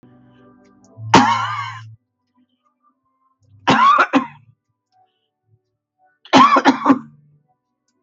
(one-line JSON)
{"three_cough_length": "8.0 s", "three_cough_amplitude": 32768, "three_cough_signal_mean_std_ratio": 0.36, "survey_phase": "beta (2021-08-13 to 2022-03-07)", "age": "65+", "gender": "Female", "wearing_mask": "No", "symptom_none": true, "smoker_status": "Prefer not to say", "respiratory_condition_asthma": false, "respiratory_condition_other": false, "recruitment_source": "REACT", "submission_delay": "3 days", "covid_test_result": "Negative", "covid_test_method": "RT-qPCR", "influenza_a_test_result": "Negative", "influenza_b_test_result": "Negative"}